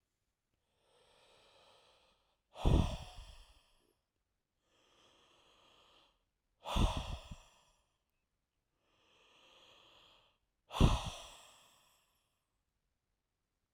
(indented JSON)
{
  "exhalation_length": "13.7 s",
  "exhalation_amplitude": 6393,
  "exhalation_signal_mean_std_ratio": 0.23,
  "survey_phase": "alpha (2021-03-01 to 2021-08-12)",
  "age": "18-44",
  "gender": "Male",
  "wearing_mask": "No",
  "symptom_none": true,
  "smoker_status": "Never smoked",
  "respiratory_condition_asthma": false,
  "respiratory_condition_other": false,
  "recruitment_source": "REACT",
  "submission_delay": "2 days",
  "covid_test_result": "Negative",
  "covid_test_method": "RT-qPCR"
}